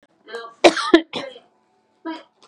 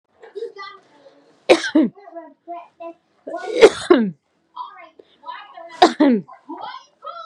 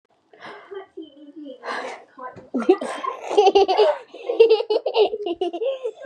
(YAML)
cough_length: 2.5 s
cough_amplitude: 32767
cough_signal_mean_std_ratio: 0.29
three_cough_length: 7.3 s
three_cough_amplitude: 32768
three_cough_signal_mean_std_ratio: 0.34
exhalation_length: 6.1 s
exhalation_amplitude: 26413
exhalation_signal_mean_std_ratio: 0.53
survey_phase: beta (2021-08-13 to 2022-03-07)
age: 18-44
gender: Female
wearing_mask: 'Yes'
symptom_none: true
smoker_status: Never smoked
respiratory_condition_asthma: false
respiratory_condition_other: false
recruitment_source: REACT
submission_delay: 1 day
covid_test_result: Negative
covid_test_method: RT-qPCR
influenza_a_test_result: Negative
influenza_b_test_result: Negative